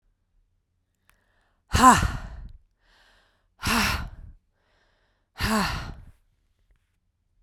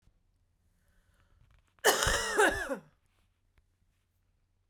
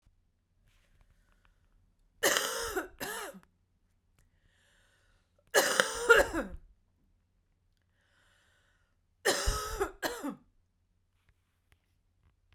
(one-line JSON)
{"exhalation_length": "7.4 s", "exhalation_amplitude": 24841, "exhalation_signal_mean_std_ratio": 0.3, "cough_length": "4.7 s", "cough_amplitude": 12331, "cough_signal_mean_std_ratio": 0.33, "three_cough_length": "12.5 s", "three_cough_amplitude": 18451, "three_cough_signal_mean_std_ratio": 0.3, "survey_phase": "beta (2021-08-13 to 2022-03-07)", "age": "18-44", "gender": "Female", "wearing_mask": "No", "symptom_cough_any": true, "symptom_shortness_of_breath": true, "symptom_sore_throat": true, "symptom_fatigue": true, "symptom_change_to_sense_of_smell_or_taste": true, "symptom_loss_of_taste": true, "symptom_other": true, "symptom_onset": "3 days", "smoker_status": "Never smoked", "respiratory_condition_asthma": true, "respiratory_condition_other": false, "recruitment_source": "Test and Trace", "submission_delay": "2 days", "covid_test_result": "Positive", "covid_test_method": "RT-qPCR", "covid_ct_value": 16.2, "covid_ct_gene": "ORF1ab gene", "covid_ct_mean": 16.7, "covid_viral_load": "3400000 copies/ml", "covid_viral_load_category": "High viral load (>1M copies/ml)"}